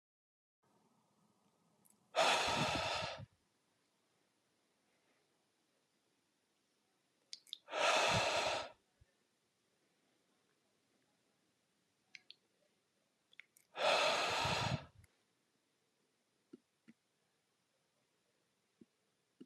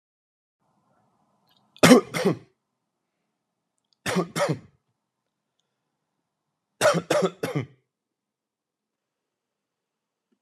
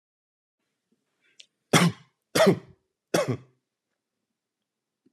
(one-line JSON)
{"exhalation_length": "19.5 s", "exhalation_amplitude": 3944, "exhalation_signal_mean_std_ratio": 0.33, "cough_length": "10.4 s", "cough_amplitude": 30635, "cough_signal_mean_std_ratio": 0.24, "three_cough_length": "5.1 s", "three_cough_amplitude": 23182, "three_cough_signal_mean_std_ratio": 0.26, "survey_phase": "alpha (2021-03-01 to 2021-08-12)", "age": "18-44", "gender": "Male", "wearing_mask": "No", "symptom_none": true, "smoker_status": "Ex-smoker", "respiratory_condition_asthma": false, "respiratory_condition_other": false, "recruitment_source": "REACT", "submission_delay": "2 days", "covid_test_result": "Negative", "covid_test_method": "RT-qPCR"}